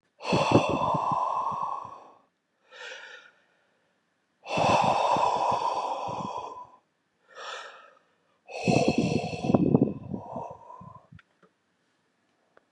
{
  "exhalation_length": "12.7 s",
  "exhalation_amplitude": 20241,
  "exhalation_signal_mean_std_ratio": 0.53,
  "survey_phase": "beta (2021-08-13 to 2022-03-07)",
  "age": "45-64",
  "gender": "Male",
  "wearing_mask": "No",
  "symptom_fatigue": true,
  "symptom_onset": "11 days",
  "smoker_status": "Ex-smoker",
  "respiratory_condition_asthma": false,
  "respiratory_condition_other": false,
  "recruitment_source": "REACT",
  "submission_delay": "1 day",
  "covid_test_result": "Negative",
  "covid_test_method": "RT-qPCR",
  "influenza_a_test_result": "Negative",
  "influenza_b_test_result": "Negative"
}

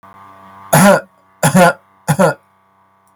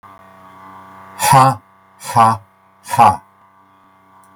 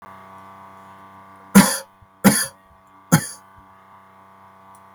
{
  "cough_length": "3.2 s",
  "cough_amplitude": 32768,
  "cough_signal_mean_std_ratio": 0.45,
  "exhalation_length": "4.4 s",
  "exhalation_amplitude": 32768,
  "exhalation_signal_mean_std_ratio": 0.37,
  "three_cough_length": "4.9 s",
  "three_cough_amplitude": 32768,
  "three_cough_signal_mean_std_ratio": 0.27,
  "survey_phase": "beta (2021-08-13 to 2022-03-07)",
  "age": "65+",
  "gender": "Male",
  "wearing_mask": "No",
  "symptom_none": true,
  "smoker_status": "Never smoked",
  "respiratory_condition_asthma": false,
  "respiratory_condition_other": false,
  "recruitment_source": "REACT",
  "submission_delay": "2 days",
  "covid_test_result": "Negative",
  "covid_test_method": "RT-qPCR",
  "influenza_a_test_result": "Negative",
  "influenza_b_test_result": "Negative"
}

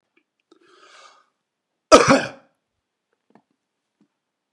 {
  "cough_length": "4.5 s",
  "cough_amplitude": 32768,
  "cough_signal_mean_std_ratio": 0.19,
  "survey_phase": "beta (2021-08-13 to 2022-03-07)",
  "age": "45-64",
  "gender": "Male",
  "wearing_mask": "No",
  "symptom_none": true,
  "smoker_status": "Never smoked",
  "respiratory_condition_asthma": false,
  "respiratory_condition_other": false,
  "recruitment_source": "REACT",
  "submission_delay": "1 day",
  "covid_test_result": "Negative",
  "covid_test_method": "RT-qPCR",
  "influenza_a_test_result": "Negative",
  "influenza_b_test_result": "Negative"
}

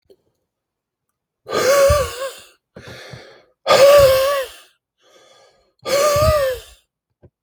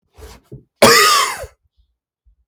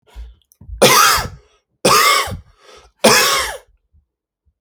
{
  "exhalation_length": "7.4 s",
  "exhalation_amplitude": 28201,
  "exhalation_signal_mean_std_ratio": 0.47,
  "cough_length": "2.5 s",
  "cough_amplitude": 32768,
  "cough_signal_mean_std_ratio": 0.39,
  "three_cough_length": "4.6 s",
  "three_cough_amplitude": 32768,
  "three_cough_signal_mean_std_ratio": 0.47,
  "survey_phase": "alpha (2021-03-01 to 2021-08-12)",
  "age": "18-44",
  "gender": "Male",
  "wearing_mask": "No",
  "symptom_none": true,
  "smoker_status": "Never smoked",
  "respiratory_condition_asthma": false,
  "respiratory_condition_other": false,
  "recruitment_source": "REACT",
  "submission_delay": "1 day",
  "covid_test_result": "Negative",
  "covid_test_method": "RT-qPCR"
}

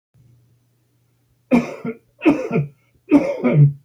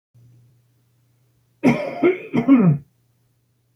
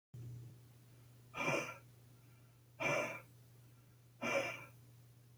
{
  "three_cough_length": "3.8 s",
  "three_cough_amplitude": 25833,
  "three_cough_signal_mean_std_ratio": 0.44,
  "cough_length": "3.8 s",
  "cough_amplitude": 23711,
  "cough_signal_mean_std_ratio": 0.39,
  "exhalation_length": "5.4 s",
  "exhalation_amplitude": 1968,
  "exhalation_signal_mean_std_ratio": 0.49,
  "survey_phase": "alpha (2021-03-01 to 2021-08-12)",
  "age": "65+",
  "gender": "Male",
  "wearing_mask": "No",
  "symptom_none": true,
  "smoker_status": "Ex-smoker",
  "respiratory_condition_asthma": false,
  "respiratory_condition_other": false,
  "recruitment_source": "REACT",
  "submission_delay": "1 day",
  "covid_test_result": "Negative",
  "covid_test_method": "RT-qPCR"
}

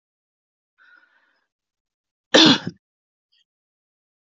{
  "cough_length": "4.4 s",
  "cough_amplitude": 27357,
  "cough_signal_mean_std_ratio": 0.19,
  "survey_phase": "beta (2021-08-13 to 2022-03-07)",
  "age": "45-64",
  "gender": "Female",
  "wearing_mask": "No",
  "symptom_cough_any": true,
  "symptom_runny_or_blocked_nose": true,
  "symptom_sore_throat": true,
  "symptom_fatigue": true,
  "symptom_fever_high_temperature": true,
  "symptom_headache": true,
  "symptom_change_to_sense_of_smell_or_taste": true,
  "symptom_onset": "4 days",
  "smoker_status": "Never smoked",
  "respiratory_condition_asthma": false,
  "respiratory_condition_other": false,
  "recruitment_source": "Test and Trace",
  "submission_delay": "2 days",
  "covid_test_result": "Positive",
  "covid_test_method": "ePCR"
}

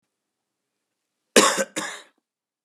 {
  "cough_length": "2.6 s",
  "cough_amplitude": 30154,
  "cough_signal_mean_std_ratio": 0.26,
  "survey_phase": "beta (2021-08-13 to 2022-03-07)",
  "age": "45-64",
  "gender": "Male",
  "wearing_mask": "Yes",
  "symptom_cough_any": true,
  "symptom_runny_or_blocked_nose": true,
  "symptom_onset": "3 days",
  "smoker_status": "Ex-smoker",
  "respiratory_condition_asthma": false,
  "respiratory_condition_other": false,
  "recruitment_source": "Test and Trace",
  "submission_delay": "2 days",
  "covid_test_result": "Positive",
  "covid_test_method": "RT-qPCR",
  "covid_ct_value": 22.2,
  "covid_ct_gene": "ORF1ab gene"
}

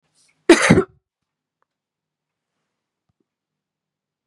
{
  "cough_length": "4.3 s",
  "cough_amplitude": 32768,
  "cough_signal_mean_std_ratio": 0.2,
  "survey_phase": "beta (2021-08-13 to 2022-03-07)",
  "age": "18-44",
  "gender": "Female",
  "wearing_mask": "No",
  "symptom_cough_any": true,
  "symptom_new_continuous_cough": true,
  "symptom_runny_or_blocked_nose": true,
  "symptom_sore_throat": true,
  "symptom_fatigue": true,
  "symptom_headache": true,
  "symptom_other": true,
  "symptom_onset": "3 days",
  "smoker_status": "Never smoked",
  "respiratory_condition_asthma": false,
  "respiratory_condition_other": false,
  "recruitment_source": "Test and Trace",
  "submission_delay": "2 days",
  "covid_test_result": "Positive",
  "covid_test_method": "RT-qPCR",
  "covid_ct_value": 14.7,
  "covid_ct_gene": "ORF1ab gene"
}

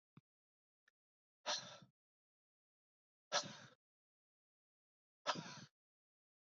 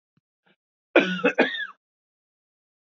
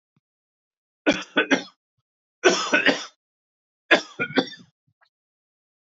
{
  "exhalation_length": "6.6 s",
  "exhalation_amplitude": 2079,
  "exhalation_signal_mean_std_ratio": 0.23,
  "cough_length": "2.8 s",
  "cough_amplitude": 25019,
  "cough_signal_mean_std_ratio": 0.31,
  "three_cough_length": "5.8 s",
  "three_cough_amplitude": 24976,
  "three_cough_signal_mean_std_ratio": 0.32,
  "survey_phase": "beta (2021-08-13 to 2022-03-07)",
  "age": "45-64",
  "gender": "Male",
  "wearing_mask": "No",
  "symptom_cough_any": true,
  "symptom_sore_throat": true,
  "symptom_fatigue": true,
  "symptom_headache": true,
  "symptom_onset": "3 days",
  "smoker_status": "Never smoked",
  "respiratory_condition_asthma": false,
  "respiratory_condition_other": false,
  "recruitment_source": "Test and Trace",
  "submission_delay": "2 days",
  "covid_test_result": "Positive",
  "covid_test_method": "ePCR"
}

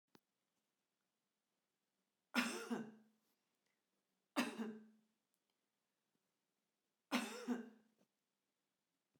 {
  "three_cough_length": "9.2 s",
  "three_cough_amplitude": 2131,
  "three_cough_signal_mean_std_ratio": 0.29,
  "survey_phase": "beta (2021-08-13 to 2022-03-07)",
  "age": "65+",
  "gender": "Female",
  "wearing_mask": "No",
  "symptom_none": true,
  "symptom_onset": "6 days",
  "smoker_status": "Ex-smoker",
  "respiratory_condition_asthma": false,
  "respiratory_condition_other": false,
  "recruitment_source": "REACT",
  "submission_delay": "1 day",
  "covid_test_result": "Negative",
  "covid_test_method": "RT-qPCR",
  "influenza_a_test_result": "Negative",
  "influenza_b_test_result": "Negative"
}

